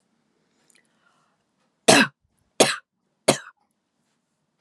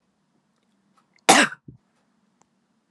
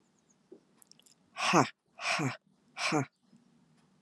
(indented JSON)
{
  "three_cough_length": "4.6 s",
  "three_cough_amplitude": 32253,
  "three_cough_signal_mean_std_ratio": 0.22,
  "cough_length": "2.9 s",
  "cough_amplitude": 31905,
  "cough_signal_mean_std_ratio": 0.2,
  "exhalation_length": "4.0 s",
  "exhalation_amplitude": 12970,
  "exhalation_signal_mean_std_ratio": 0.35,
  "survey_phase": "beta (2021-08-13 to 2022-03-07)",
  "age": "45-64",
  "gender": "Female",
  "wearing_mask": "No",
  "symptom_none": true,
  "smoker_status": "Ex-smoker",
  "respiratory_condition_asthma": false,
  "respiratory_condition_other": false,
  "recruitment_source": "REACT",
  "submission_delay": "1 day",
  "covid_test_result": "Negative",
  "covid_test_method": "RT-qPCR",
  "influenza_a_test_result": "Negative",
  "influenza_b_test_result": "Negative"
}